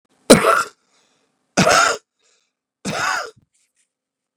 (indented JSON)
{
  "three_cough_length": "4.4 s",
  "three_cough_amplitude": 32768,
  "three_cough_signal_mean_std_ratio": 0.35,
  "survey_phase": "beta (2021-08-13 to 2022-03-07)",
  "age": "45-64",
  "gender": "Male",
  "wearing_mask": "No",
  "symptom_runny_or_blocked_nose": true,
  "symptom_change_to_sense_of_smell_or_taste": true,
  "symptom_loss_of_taste": true,
  "smoker_status": "Never smoked",
  "respiratory_condition_asthma": false,
  "respiratory_condition_other": false,
  "recruitment_source": "Test and Trace",
  "submission_delay": "1 day",
  "covid_test_result": "Positive",
  "covid_test_method": "RT-qPCR",
  "covid_ct_value": 15.2,
  "covid_ct_gene": "ORF1ab gene",
  "covid_ct_mean": 15.8,
  "covid_viral_load": "6600000 copies/ml",
  "covid_viral_load_category": "High viral load (>1M copies/ml)"
}